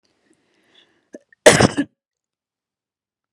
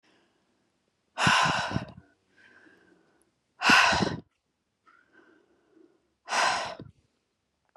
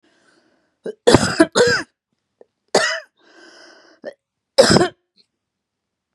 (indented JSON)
{
  "cough_length": "3.3 s",
  "cough_amplitude": 32768,
  "cough_signal_mean_std_ratio": 0.21,
  "exhalation_length": "7.8 s",
  "exhalation_amplitude": 14130,
  "exhalation_signal_mean_std_ratio": 0.35,
  "three_cough_length": "6.1 s",
  "three_cough_amplitude": 32768,
  "three_cough_signal_mean_std_ratio": 0.33,
  "survey_phase": "beta (2021-08-13 to 2022-03-07)",
  "age": "45-64",
  "gender": "Female",
  "wearing_mask": "No",
  "symptom_cough_any": true,
  "symptom_runny_or_blocked_nose": true,
  "symptom_shortness_of_breath": true,
  "symptom_sore_throat": true,
  "symptom_fatigue": true,
  "symptom_headache": true,
  "symptom_change_to_sense_of_smell_or_taste": true,
  "symptom_other": true,
  "symptom_onset": "3 days",
  "smoker_status": "Ex-smoker",
  "respiratory_condition_asthma": false,
  "respiratory_condition_other": false,
  "recruitment_source": "Test and Trace",
  "submission_delay": "1 day",
  "covid_test_result": "Positive",
  "covid_test_method": "RT-qPCR",
  "covid_ct_value": 19.8,
  "covid_ct_gene": "N gene"
}